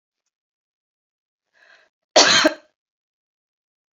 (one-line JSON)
{"cough_length": "3.9 s", "cough_amplitude": 29471, "cough_signal_mean_std_ratio": 0.23, "survey_phase": "beta (2021-08-13 to 2022-03-07)", "age": "45-64", "gender": "Female", "wearing_mask": "No", "symptom_none": true, "smoker_status": "Ex-smoker", "respiratory_condition_asthma": false, "respiratory_condition_other": false, "recruitment_source": "REACT", "submission_delay": "4 days", "covid_test_result": "Negative", "covid_test_method": "RT-qPCR"}